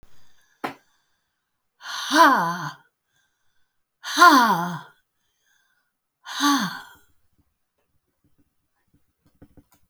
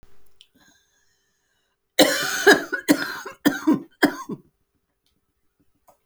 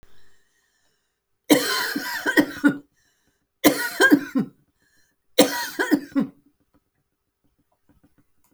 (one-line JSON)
{"exhalation_length": "9.9 s", "exhalation_amplitude": 28823, "exhalation_signal_mean_std_ratio": 0.3, "cough_length": "6.1 s", "cough_amplitude": 29736, "cough_signal_mean_std_ratio": 0.33, "three_cough_length": "8.5 s", "three_cough_amplitude": 31352, "three_cough_signal_mean_std_ratio": 0.36, "survey_phase": "alpha (2021-03-01 to 2021-08-12)", "age": "65+", "gender": "Female", "wearing_mask": "No", "symptom_none": true, "smoker_status": "Never smoked", "respiratory_condition_asthma": false, "respiratory_condition_other": false, "recruitment_source": "REACT", "submission_delay": "1 day", "covid_test_method": "RT-qPCR"}